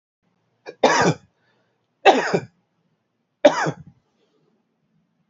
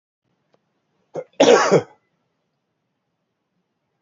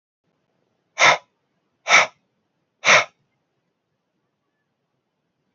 {
  "three_cough_length": "5.3 s",
  "three_cough_amplitude": 27356,
  "three_cough_signal_mean_std_ratio": 0.29,
  "cough_length": "4.0 s",
  "cough_amplitude": 27833,
  "cough_signal_mean_std_ratio": 0.26,
  "exhalation_length": "5.5 s",
  "exhalation_amplitude": 28661,
  "exhalation_signal_mean_std_ratio": 0.24,
  "survey_phase": "beta (2021-08-13 to 2022-03-07)",
  "age": "45-64",
  "gender": "Male",
  "wearing_mask": "No",
  "symptom_none": true,
  "smoker_status": "Never smoked",
  "respiratory_condition_asthma": false,
  "respiratory_condition_other": false,
  "recruitment_source": "REACT",
  "submission_delay": "3 days",
  "covid_test_result": "Negative",
  "covid_test_method": "RT-qPCR",
  "influenza_a_test_result": "Negative",
  "influenza_b_test_result": "Negative"
}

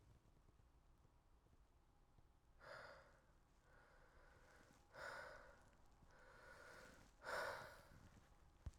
{
  "exhalation_length": "8.8 s",
  "exhalation_amplitude": 457,
  "exhalation_signal_mean_std_ratio": 0.55,
  "survey_phase": "alpha (2021-03-01 to 2021-08-12)",
  "age": "18-44",
  "gender": "Male",
  "wearing_mask": "No",
  "symptom_fatigue": true,
  "symptom_headache": true,
  "symptom_loss_of_taste": true,
  "symptom_onset": "4 days",
  "smoker_status": "Ex-smoker",
  "respiratory_condition_asthma": false,
  "respiratory_condition_other": false,
  "recruitment_source": "Test and Trace",
  "submission_delay": "2 days",
  "covid_test_result": "Positive",
  "covid_test_method": "RT-qPCR",
  "covid_ct_value": 29.1,
  "covid_ct_gene": "N gene"
}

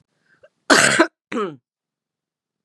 {
  "cough_length": "2.6 s",
  "cough_amplitude": 32767,
  "cough_signal_mean_std_ratio": 0.33,
  "survey_phase": "beta (2021-08-13 to 2022-03-07)",
  "age": "45-64",
  "gender": "Female",
  "wearing_mask": "No",
  "symptom_cough_any": true,
  "symptom_runny_or_blocked_nose": true,
  "symptom_sore_throat": true,
  "symptom_fatigue": true,
  "symptom_change_to_sense_of_smell_or_taste": true,
  "symptom_onset": "3 days",
  "smoker_status": "Never smoked",
  "respiratory_condition_asthma": false,
  "respiratory_condition_other": false,
  "recruitment_source": "Test and Trace",
  "submission_delay": "1 day",
  "covid_test_result": "Positive",
  "covid_test_method": "RT-qPCR",
  "covid_ct_value": 22.1,
  "covid_ct_gene": "N gene"
}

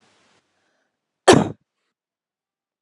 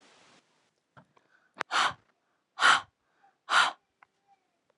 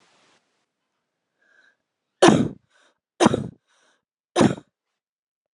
{
  "cough_length": "2.8 s",
  "cough_amplitude": 32767,
  "cough_signal_mean_std_ratio": 0.19,
  "exhalation_length": "4.8 s",
  "exhalation_amplitude": 10744,
  "exhalation_signal_mean_std_ratio": 0.28,
  "three_cough_length": "5.5 s",
  "three_cough_amplitude": 32767,
  "three_cough_signal_mean_std_ratio": 0.24,
  "survey_phase": "beta (2021-08-13 to 2022-03-07)",
  "age": "18-44",
  "gender": "Female",
  "wearing_mask": "No",
  "symptom_cough_any": true,
  "symptom_runny_or_blocked_nose": true,
  "symptom_sore_throat": true,
  "symptom_fatigue": true,
  "symptom_headache": true,
  "symptom_change_to_sense_of_smell_or_taste": true,
  "symptom_other": true,
  "symptom_onset": "4 days",
  "smoker_status": "Never smoked",
  "respiratory_condition_asthma": false,
  "respiratory_condition_other": false,
  "recruitment_source": "Test and Trace",
  "submission_delay": "2 days",
  "covid_test_result": "Positive",
  "covid_test_method": "RT-qPCR",
  "covid_ct_value": 14.6,
  "covid_ct_gene": "ORF1ab gene"
}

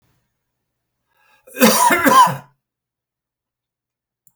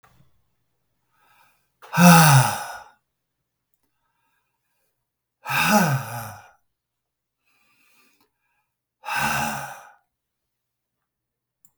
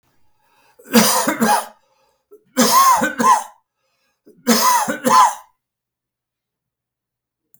{
  "cough_length": "4.4 s",
  "cough_amplitude": 32768,
  "cough_signal_mean_std_ratio": 0.34,
  "exhalation_length": "11.8 s",
  "exhalation_amplitude": 32768,
  "exhalation_signal_mean_std_ratio": 0.29,
  "three_cough_length": "7.6 s",
  "three_cough_amplitude": 32768,
  "three_cough_signal_mean_std_ratio": 0.45,
  "survey_phase": "beta (2021-08-13 to 2022-03-07)",
  "age": "65+",
  "gender": "Male",
  "wearing_mask": "No",
  "symptom_none": true,
  "symptom_onset": "7 days",
  "smoker_status": "Never smoked",
  "respiratory_condition_asthma": false,
  "respiratory_condition_other": false,
  "recruitment_source": "REACT",
  "submission_delay": "1 day",
  "covid_test_result": "Negative",
  "covid_test_method": "RT-qPCR",
  "influenza_a_test_result": "Negative",
  "influenza_b_test_result": "Negative"
}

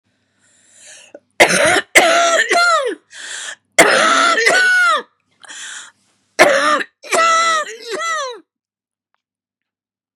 {
  "three_cough_length": "10.2 s",
  "three_cough_amplitude": 32768,
  "three_cough_signal_mean_std_ratio": 0.57,
  "survey_phase": "beta (2021-08-13 to 2022-03-07)",
  "age": "45-64",
  "gender": "Female",
  "wearing_mask": "No",
  "symptom_cough_any": true,
  "symptom_runny_or_blocked_nose": true,
  "symptom_shortness_of_breath": true,
  "symptom_sore_throat": true,
  "symptom_abdominal_pain": true,
  "symptom_headache": true,
  "symptom_change_to_sense_of_smell_or_taste": true,
  "symptom_onset": "5 days",
  "smoker_status": "Never smoked",
  "respiratory_condition_asthma": false,
  "respiratory_condition_other": false,
  "recruitment_source": "REACT",
  "submission_delay": "1 day",
  "covid_test_result": "Negative",
  "covid_test_method": "RT-qPCR",
  "influenza_a_test_result": "Unknown/Void",
  "influenza_b_test_result": "Unknown/Void"
}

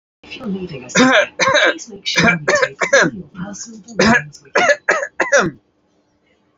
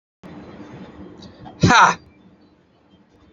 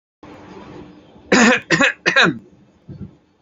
{
  "three_cough_length": "6.6 s",
  "three_cough_amplitude": 32242,
  "three_cough_signal_mean_std_ratio": 0.56,
  "exhalation_length": "3.3 s",
  "exhalation_amplitude": 28903,
  "exhalation_signal_mean_std_ratio": 0.29,
  "cough_length": "3.4 s",
  "cough_amplitude": 30002,
  "cough_signal_mean_std_ratio": 0.42,
  "survey_phase": "beta (2021-08-13 to 2022-03-07)",
  "age": "45-64",
  "gender": "Male",
  "wearing_mask": "Yes",
  "symptom_none": true,
  "smoker_status": "Never smoked",
  "respiratory_condition_asthma": false,
  "respiratory_condition_other": false,
  "recruitment_source": "REACT",
  "submission_delay": "2 days",
  "covid_test_result": "Negative",
  "covid_test_method": "RT-qPCR",
  "influenza_a_test_result": "Negative",
  "influenza_b_test_result": "Negative"
}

